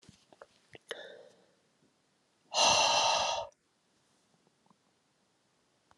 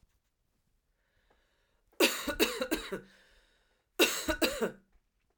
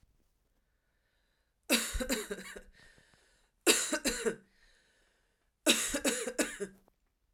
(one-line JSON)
{"exhalation_length": "6.0 s", "exhalation_amplitude": 6862, "exhalation_signal_mean_std_ratio": 0.34, "cough_length": "5.4 s", "cough_amplitude": 10374, "cough_signal_mean_std_ratio": 0.37, "three_cough_length": "7.3 s", "three_cough_amplitude": 10816, "three_cough_signal_mean_std_ratio": 0.39, "survey_phase": "alpha (2021-03-01 to 2021-08-12)", "age": "18-44", "gender": "Female", "wearing_mask": "No", "symptom_shortness_of_breath": true, "symptom_fatigue": true, "symptom_change_to_sense_of_smell_or_taste": true, "symptom_loss_of_taste": true, "smoker_status": "Never smoked", "respiratory_condition_asthma": false, "respiratory_condition_other": false, "recruitment_source": "Test and Trace", "submission_delay": "1 day", "covid_test_result": "Positive", "covid_test_method": "RT-qPCR", "covid_ct_value": 13.7, "covid_ct_gene": "S gene", "covid_ct_mean": 14.2, "covid_viral_load": "22000000 copies/ml", "covid_viral_load_category": "High viral load (>1M copies/ml)"}